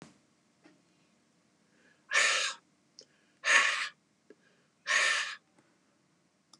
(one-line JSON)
{"exhalation_length": "6.6 s", "exhalation_amplitude": 11185, "exhalation_signal_mean_std_ratio": 0.36, "survey_phase": "beta (2021-08-13 to 2022-03-07)", "age": "65+", "gender": "Male", "wearing_mask": "No", "symptom_cough_any": true, "smoker_status": "Ex-smoker", "respiratory_condition_asthma": false, "respiratory_condition_other": false, "recruitment_source": "REACT", "submission_delay": "2 days", "covid_test_result": "Negative", "covid_test_method": "RT-qPCR", "influenza_a_test_result": "Negative", "influenza_b_test_result": "Negative"}